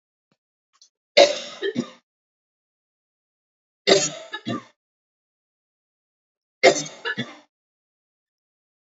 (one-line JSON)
{"three_cough_length": "9.0 s", "three_cough_amplitude": 30329, "three_cough_signal_mean_std_ratio": 0.24, "survey_phase": "alpha (2021-03-01 to 2021-08-12)", "age": "45-64", "gender": "Female", "wearing_mask": "No", "symptom_none": true, "smoker_status": "Never smoked", "respiratory_condition_asthma": false, "respiratory_condition_other": false, "recruitment_source": "REACT", "submission_delay": "4 days", "covid_test_result": "Negative", "covid_test_method": "RT-qPCR"}